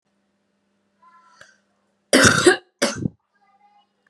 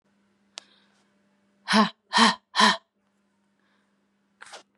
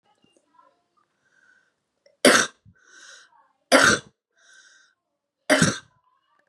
cough_length: 4.1 s
cough_amplitude: 32767
cough_signal_mean_std_ratio: 0.29
exhalation_length: 4.8 s
exhalation_amplitude: 19829
exhalation_signal_mean_std_ratio: 0.28
three_cough_length: 6.5 s
three_cough_amplitude: 32085
three_cough_signal_mean_std_ratio: 0.26
survey_phase: beta (2021-08-13 to 2022-03-07)
age: 18-44
gender: Male
wearing_mask: 'No'
symptom_cough_any: true
symptom_runny_or_blocked_nose: true
symptom_sore_throat: true
symptom_fatigue: true
symptom_headache: true
symptom_onset: 3 days
smoker_status: Never smoked
respiratory_condition_asthma: false
respiratory_condition_other: false
recruitment_source: Test and Trace
submission_delay: 2 days
covid_test_result: Negative
covid_test_method: RT-qPCR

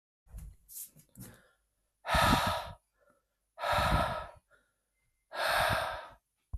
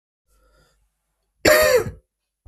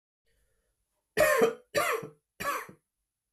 exhalation_length: 6.6 s
exhalation_amplitude: 6353
exhalation_signal_mean_std_ratio: 0.47
cough_length: 2.5 s
cough_amplitude: 29043
cough_signal_mean_std_ratio: 0.34
three_cough_length: 3.3 s
three_cough_amplitude: 8152
three_cough_signal_mean_std_ratio: 0.4
survey_phase: beta (2021-08-13 to 2022-03-07)
age: 18-44
gender: Male
wearing_mask: 'No'
symptom_cough_any: true
symptom_runny_or_blocked_nose: true
symptom_fatigue: true
symptom_change_to_sense_of_smell_or_taste: true
symptom_onset: 3 days
smoker_status: Never smoked
respiratory_condition_asthma: false
respiratory_condition_other: false
recruitment_source: Test and Trace
submission_delay: 2 days
covid_test_result: Positive
covid_test_method: RT-qPCR
covid_ct_value: 26.2
covid_ct_gene: N gene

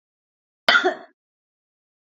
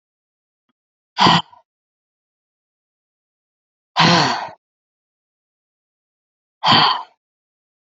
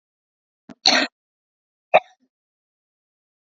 cough_length: 2.1 s
cough_amplitude: 27215
cough_signal_mean_std_ratio: 0.26
exhalation_length: 7.9 s
exhalation_amplitude: 29288
exhalation_signal_mean_std_ratio: 0.29
three_cough_length: 3.4 s
three_cough_amplitude: 28882
three_cough_signal_mean_std_ratio: 0.2
survey_phase: beta (2021-08-13 to 2022-03-07)
age: 45-64
gender: Female
wearing_mask: 'No'
symptom_sore_throat: true
symptom_fatigue: true
symptom_headache: true
symptom_onset: 3 days
smoker_status: Current smoker (1 to 10 cigarettes per day)
respiratory_condition_asthma: false
respiratory_condition_other: false
recruitment_source: Test and Trace
submission_delay: 2 days
covid_test_result: Positive
covid_test_method: RT-qPCR
covid_ct_value: 22.5
covid_ct_gene: N gene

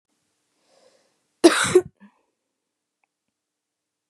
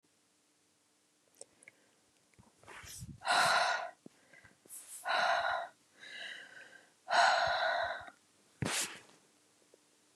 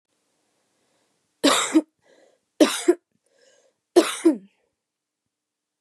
cough_length: 4.1 s
cough_amplitude: 31402
cough_signal_mean_std_ratio: 0.2
exhalation_length: 10.2 s
exhalation_amplitude: 5697
exhalation_signal_mean_std_ratio: 0.44
three_cough_length: 5.8 s
three_cough_amplitude: 24570
three_cough_signal_mean_std_ratio: 0.28
survey_phase: beta (2021-08-13 to 2022-03-07)
age: 18-44
gender: Female
wearing_mask: 'No'
symptom_none: true
smoker_status: Never smoked
respiratory_condition_asthma: false
respiratory_condition_other: false
recruitment_source: REACT
submission_delay: 5 days
covid_test_result: Negative
covid_test_method: RT-qPCR
influenza_a_test_result: Negative
influenza_b_test_result: Negative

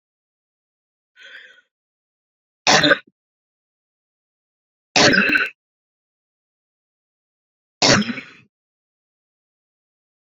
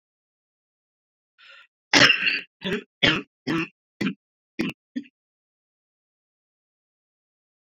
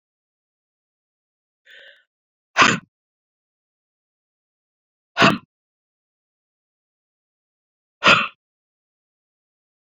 three_cough_length: 10.2 s
three_cough_amplitude: 32768
three_cough_signal_mean_std_ratio: 0.26
cough_length: 7.7 s
cough_amplitude: 29919
cough_signal_mean_std_ratio: 0.28
exhalation_length: 9.8 s
exhalation_amplitude: 29201
exhalation_signal_mean_std_ratio: 0.19
survey_phase: beta (2021-08-13 to 2022-03-07)
age: 18-44
gender: Female
wearing_mask: 'No'
symptom_cough_any: true
symptom_runny_or_blocked_nose: true
symptom_fatigue: true
symptom_onset: 2 days
smoker_status: Ex-smoker
respiratory_condition_asthma: false
respiratory_condition_other: false
recruitment_source: Test and Trace
submission_delay: 1 day
covid_test_result: Positive
covid_test_method: RT-qPCR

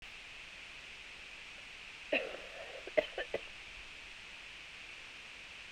cough_length: 5.7 s
cough_amplitude: 6977
cough_signal_mean_std_ratio: 0.58
survey_phase: beta (2021-08-13 to 2022-03-07)
age: 45-64
gender: Female
wearing_mask: 'No'
symptom_runny_or_blocked_nose: true
symptom_fatigue: true
symptom_headache: true
symptom_change_to_sense_of_smell_or_taste: true
symptom_loss_of_taste: true
symptom_other: true
symptom_onset: 4 days
smoker_status: Current smoker (1 to 10 cigarettes per day)
respiratory_condition_asthma: true
respiratory_condition_other: false
recruitment_source: Test and Trace
submission_delay: 1 day
covid_test_result: Positive
covid_test_method: RT-qPCR
covid_ct_value: 18.4
covid_ct_gene: ORF1ab gene
covid_ct_mean: 19.1
covid_viral_load: 540000 copies/ml
covid_viral_load_category: Low viral load (10K-1M copies/ml)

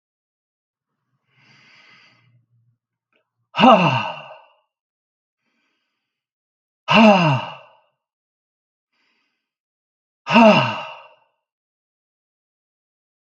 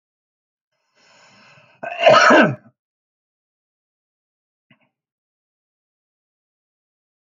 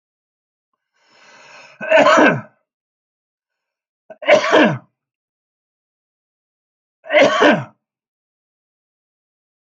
exhalation_length: 13.3 s
exhalation_amplitude: 31208
exhalation_signal_mean_std_ratio: 0.27
cough_length: 7.3 s
cough_amplitude: 28358
cough_signal_mean_std_ratio: 0.22
three_cough_length: 9.6 s
three_cough_amplitude: 32768
three_cough_signal_mean_std_ratio: 0.32
survey_phase: alpha (2021-03-01 to 2021-08-12)
age: 65+
gender: Male
wearing_mask: 'No'
symptom_none: true
smoker_status: Ex-smoker
respiratory_condition_asthma: false
respiratory_condition_other: false
recruitment_source: REACT
submission_delay: 1 day
covid_test_result: Negative
covid_test_method: RT-qPCR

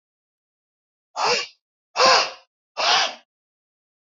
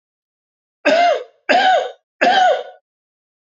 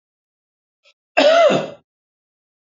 exhalation_length: 4.1 s
exhalation_amplitude: 22225
exhalation_signal_mean_std_ratio: 0.37
three_cough_length: 3.6 s
three_cough_amplitude: 26639
three_cough_signal_mean_std_ratio: 0.51
cough_length: 2.6 s
cough_amplitude: 27720
cough_signal_mean_std_ratio: 0.36
survey_phase: alpha (2021-03-01 to 2021-08-12)
age: 45-64
gender: Male
wearing_mask: 'No'
symptom_cough_any: true
symptom_shortness_of_breath: true
symptom_headache: true
smoker_status: Never smoked
respiratory_condition_asthma: true
respiratory_condition_other: false
recruitment_source: Test and Trace
submission_delay: 2 days
covid_test_result: Positive
covid_test_method: RT-qPCR
covid_ct_value: 24.2
covid_ct_gene: ORF1ab gene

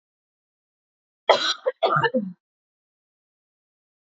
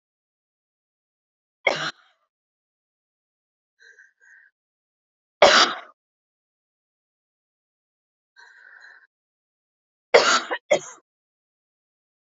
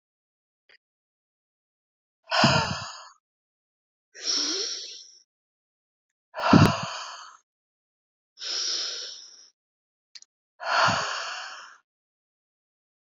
cough_length: 4.1 s
cough_amplitude: 27554
cough_signal_mean_std_ratio: 0.31
three_cough_length: 12.2 s
three_cough_amplitude: 28569
three_cough_signal_mean_std_ratio: 0.2
exhalation_length: 13.1 s
exhalation_amplitude: 26093
exhalation_signal_mean_std_ratio: 0.34
survey_phase: beta (2021-08-13 to 2022-03-07)
age: 18-44
gender: Female
wearing_mask: 'No'
symptom_cough_any: true
symptom_runny_or_blocked_nose: true
symptom_shortness_of_breath: true
symptom_fatigue: true
symptom_headache: true
smoker_status: Never smoked
respiratory_condition_asthma: true
respiratory_condition_other: false
recruitment_source: Test and Trace
submission_delay: 2 days
covid_test_result: Positive
covid_test_method: RT-qPCR
covid_ct_value: 28.6
covid_ct_gene: ORF1ab gene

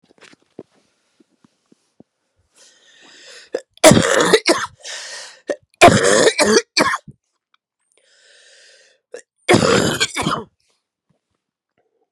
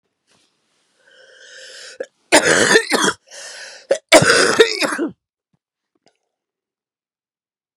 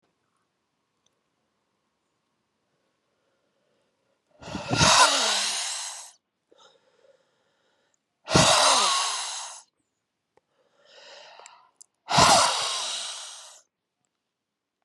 three_cough_length: 12.1 s
three_cough_amplitude: 32768
three_cough_signal_mean_std_ratio: 0.35
cough_length: 7.8 s
cough_amplitude: 32768
cough_signal_mean_std_ratio: 0.36
exhalation_length: 14.8 s
exhalation_amplitude: 22354
exhalation_signal_mean_std_ratio: 0.36
survey_phase: beta (2021-08-13 to 2022-03-07)
age: 45-64
gender: Female
wearing_mask: 'No'
symptom_cough_any: true
symptom_runny_or_blocked_nose: true
symptom_fatigue: true
symptom_headache: true
symptom_change_to_sense_of_smell_or_taste: true
symptom_loss_of_taste: true
symptom_onset: 3 days
smoker_status: Ex-smoker
respiratory_condition_asthma: false
respiratory_condition_other: false
recruitment_source: Test and Trace
submission_delay: 2 days
covid_test_result: Positive
covid_test_method: RT-qPCR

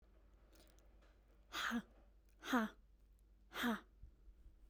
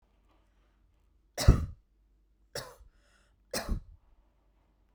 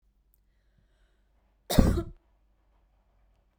exhalation_length: 4.7 s
exhalation_amplitude: 2057
exhalation_signal_mean_std_ratio: 0.4
three_cough_length: 4.9 s
three_cough_amplitude: 14995
three_cough_signal_mean_std_ratio: 0.2
cough_length: 3.6 s
cough_amplitude: 24937
cough_signal_mean_std_ratio: 0.22
survey_phase: beta (2021-08-13 to 2022-03-07)
age: 18-44
gender: Female
wearing_mask: 'No'
symptom_none: true
smoker_status: Ex-smoker
respiratory_condition_asthma: false
respiratory_condition_other: false
recruitment_source: REACT
submission_delay: 3 days
covid_test_result: Negative
covid_test_method: RT-qPCR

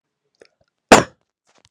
cough_length: 1.7 s
cough_amplitude: 32768
cough_signal_mean_std_ratio: 0.19
survey_phase: beta (2021-08-13 to 2022-03-07)
age: 18-44
gender: Male
wearing_mask: 'No'
symptom_cough_any: true
symptom_runny_or_blocked_nose: true
symptom_sore_throat: true
symptom_fatigue: true
symptom_onset: 2 days
smoker_status: Never smoked
respiratory_condition_asthma: false
respiratory_condition_other: false
recruitment_source: Test and Trace
submission_delay: 1 day
covid_test_result: Positive
covid_test_method: ePCR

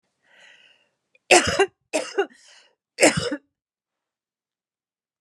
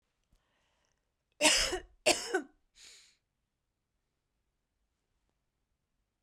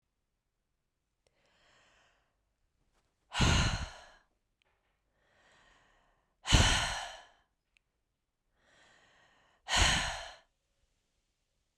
three_cough_length: 5.2 s
three_cough_amplitude: 29600
three_cough_signal_mean_std_ratio: 0.28
cough_length: 6.2 s
cough_amplitude: 9634
cough_signal_mean_std_ratio: 0.25
exhalation_length: 11.8 s
exhalation_amplitude: 10089
exhalation_signal_mean_std_ratio: 0.28
survey_phase: beta (2021-08-13 to 2022-03-07)
age: 45-64
gender: Female
wearing_mask: 'No'
symptom_cough_any: true
symptom_fatigue: true
symptom_fever_high_temperature: true
symptom_change_to_sense_of_smell_or_taste: true
symptom_onset: 4 days
smoker_status: Never smoked
respiratory_condition_asthma: false
respiratory_condition_other: false
recruitment_source: Test and Trace
submission_delay: 1 day
covid_test_result: Positive
covid_test_method: ePCR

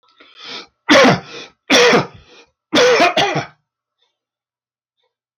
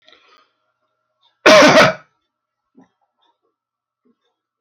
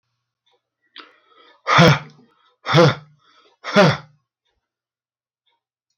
three_cough_length: 5.4 s
three_cough_amplitude: 32768
three_cough_signal_mean_std_ratio: 0.45
cough_length: 4.6 s
cough_amplitude: 32768
cough_signal_mean_std_ratio: 0.29
exhalation_length: 6.0 s
exhalation_amplitude: 32768
exhalation_signal_mean_std_ratio: 0.3
survey_phase: beta (2021-08-13 to 2022-03-07)
age: 65+
gender: Male
wearing_mask: 'No'
symptom_none: true
smoker_status: Ex-smoker
respiratory_condition_asthma: false
respiratory_condition_other: false
recruitment_source: REACT
submission_delay: 2 days
covid_test_result: Negative
covid_test_method: RT-qPCR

